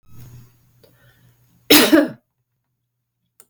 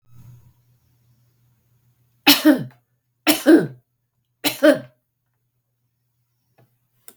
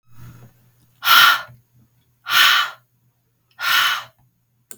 {"cough_length": "3.5 s", "cough_amplitude": 32768, "cough_signal_mean_std_ratio": 0.26, "three_cough_length": "7.2 s", "three_cough_amplitude": 32768, "three_cough_signal_mean_std_ratio": 0.26, "exhalation_length": "4.8 s", "exhalation_amplitude": 32768, "exhalation_signal_mean_std_ratio": 0.4, "survey_phase": "beta (2021-08-13 to 2022-03-07)", "age": "45-64", "gender": "Female", "wearing_mask": "No", "symptom_runny_or_blocked_nose": true, "smoker_status": "Ex-smoker", "respiratory_condition_asthma": false, "respiratory_condition_other": false, "recruitment_source": "REACT", "submission_delay": "2 days", "covid_test_result": "Negative", "covid_test_method": "RT-qPCR", "influenza_a_test_result": "Negative", "influenza_b_test_result": "Negative"}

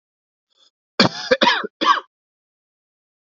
{"cough_length": "3.3 s", "cough_amplitude": 31119, "cough_signal_mean_std_ratio": 0.32, "survey_phase": "beta (2021-08-13 to 2022-03-07)", "age": "18-44", "gender": "Male", "wearing_mask": "No", "symptom_cough_any": true, "symptom_runny_or_blocked_nose": true, "symptom_sore_throat": true, "symptom_fatigue": true, "smoker_status": "Never smoked", "respiratory_condition_asthma": false, "respiratory_condition_other": false, "recruitment_source": "Test and Trace", "submission_delay": "1 day", "covid_test_result": "Negative", "covid_test_method": "LFT"}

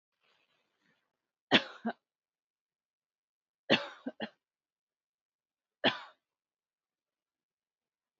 {"three_cough_length": "8.2 s", "three_cough_amplitude": 10359, "three_cough_signal_mean_std_ratio": 0.17, "survey_phase": "beta (2021-08-13 to 2022-03-07)", "age": "18-44", "gender": "Female", "wearing_mask": "No", "symptom_none": true, "smoker_status": "Never smoked", "respiratory_condition_asthma": true, "respiratory_condition_other": false, "recruitment_source": "REACT", "submission_delay": "3 days", "covid_test_result": "Negative", "covid_test_method": "RT-qPCR"}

